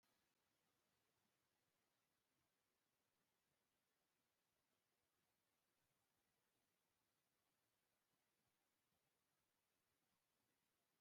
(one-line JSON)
{"exhalation_length": "11.0 s", "exhalation_amplitude": 7, "exhalation_signal_mean_std_ratio": 0.77, "survey_phase": "beta (2021-08-13 to 2022-03-07)", "age": "65+", "gender": "Male", "wearing_mask": "No", "symptom_none": true, "symptom_onset": "12 days", "smoker_status": "Never smoked", "respiratory_condition_asthma": false, "respiratory_condition_other": false, "recruitment_source": "REACT", "submission_delay": "1 day", "covid_test_result": "Negative", "covid_test_method": "RT-qPCR"}